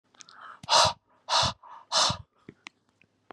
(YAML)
exhalation_length: 3.3 s
exhalation_amplitude: 14029
exhalation_signal_mean_std_ratio: 0.38
survey_phase: beta (2021-08-13 to 2022-03-07)
age: 45-64
gender: Male
wearing_mask: 'No'
symptom_none: true
smoker_status: Current smoker (1 to 10 cigarettes per day)
respiratory_condition_asthma: false
respiratory_condition_other: false
recruitment_source: REACT
submission_delay: 2 days
covid_test_result: Negative
covid_test_method: RT-qPCR